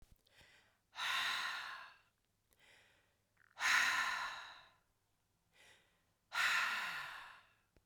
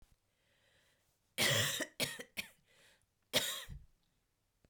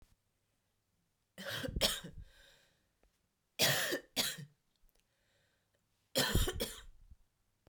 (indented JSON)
{
  "exhalation_length": "7.9 s",
  "exhalation_amplitude": 2920,
  "exhalation_signal_mean_std_ratio": 0.46,
  "cough_length": "4.7 s",
  "cough_amplitude": 4536,
  "cough_signal_mean_std_ratio": 0.37,
  "three_cough_length": "7.7 s",
  "three_cough_amplitude": 5447,
  "three_cough_signal_mean_std_ratio": 0.37,
  "survey_phase": "beta (2021-08-13 to 2022-03-07)",
  "age": "18-44",
  "gender": "Female",
  "wearing_mask": "No",
  "symptom_cough_any": true,
  "symptom_sore_throat": true,
  "symptom_fatigue": true,
  "symptom_headache": true,
  "symptom_other": true,
  "smoker_status": "Ex-smoker",
  "respiratory_condition_asthma": false,
  "respiratory_condition_other": false,
  "recruitment_source": "Test and Trace",
  "submission_delay": "1 day",
  "covid_test_result": "Positive",
  "covid_test_method": "RT-qPCR",
  "covid_ct_value": 30.2,
  "covid_ct_gene": "N gene"
}